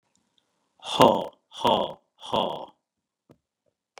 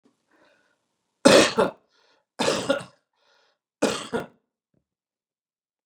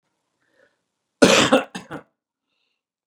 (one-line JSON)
{"exhalation_length": "4.0 s", "exhalation_amplitude": 29357, "exhalation_signal_mean_std_ratio": 0.31, "three_cough_length": "5.9 s", "three_cough_amplitude": 30968, "three_cough_signal_mean_std_ratio": 0.28, "cough_length": "3.1 s", "cough_amplitude": 32768, "cough_signal_mean_std_ratio": 0.27, "survey_phase": "beta (2021-08-13 to 2022-03-07)", "age": "45-64", "gender": "Male", "wearing_mask": "No", "symptom_none": true, "smoker_status": "Never smoked", "respiratory_condition_asthma": false, "respiratory_condition_other": false, "recruitment_source": "REACT", "submission_delay": "1 day", "covid_test_result": "Negative", "covid_test_method": "RT-qPCR", "influenza_a_test_result": "Negative", "influenza_b_test_result": "Negative"}